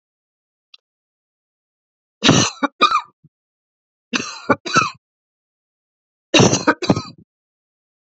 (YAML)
three_cough_length: 8.0 s
three_cough_amplitude: 31163
three_cough_signal_mean_std_ratio: 0.31
survey_phase: beta (2021-08-13 to 2022-03-07)
age: 45-64
gender: Female
wearing_mask: 'No'
symptom_cough_any: true
symptom_runny_or_blocked_nose: true
symptom_sore_throat: true
symptom_diarrhoea: true
symptom_fever_high_temperature: true
symptom_other: true
symptom_onset: 3 days
smoker_status: Never smoked
respiratory_condition_asthma: false
respiratory_condition_other: false
recruitment_source: Test and Trace
submission_delay: 1 day
covid_test_result: Positive
covid_test_method: RT-qPCR
covid_ct_value: 20.3
covid_ct_gene: ORF1ab gene
covid_ct_mean: 20.6
covid_viral_load: 180000 copies/ml
covid_viral_load_category: Low viral load (10K-1M copies/ml)